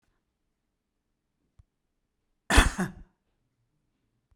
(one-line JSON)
{"cough_length": "4.4 s", "cough_amplitude": 22024, "cough_signal_mean_std_ratio": 0.18, "survey_phase": "beta (2021-08-13 to 2022-03-07)", "age": "65+", "gender": "Female", "wearing_mask": "No", "symptom_none": true, "smoker_status": "Ex-smoker", "respiratory_condition_asthma": false, "respiratory_condition_other": false, "recruitment_source": "Test and Trace", "submission_delay": "3 days", "covid_test_result": "Negative", "covid_test_method": "RT-qPCR"}